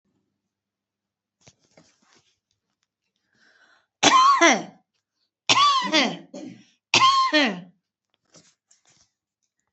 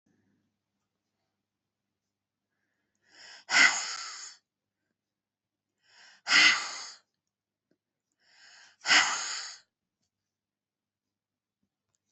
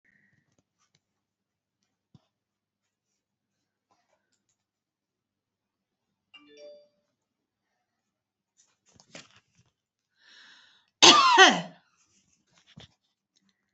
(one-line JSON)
{"three_cough_length": "9.7 s", "three_cough_amplitude": 29690, "three_cough_signal_mean_std_ratio": 0.36, "exhalation_length": "12.1 s", "exhalation_amplitude": 13154, "exhalation_signal_mean_std_ratio": 0.25, "cough_length": "13.7 s", "cough_amplitude": 32601, "cough_signal_mean_std_ratio": 0.16, "survey_phase": "alpha (2021-03-01 to 2021-08-12)", "age": "45-64", "gender": "Female", "wearing_mask": "No", "symptom_none": true, "smoker_status": "Never smoked", "respiratory_condition_asthma": true, "respiratory_condition_other": false, "recruitment_source": "REACT", "submission_delay": "1 day", "covid_test_result": "Negative", "covid_test_method": "RT-qPCR"}